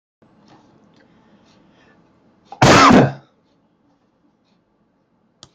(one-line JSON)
{"cough_length": "5.5 s", "cough_amplitude": 29433, "cough_signal_mean_std_ratio": 0.26, "survey_phase": "beta (2021-08-13 to 2022-03-07)", "age": "45-64", "gender": "Male", "wearing_mask": "No", "symptom_runny_or_blocked_nose": true, "smoker_status": "Never smoked", "respiratory_condition_asthma": false, "respiratory_condition_other": false, "recruitment_source": "REACT", "submission_delay": "1 day", "covid_test_result": "Negative", "covid_test_method": "RT-qPCR"}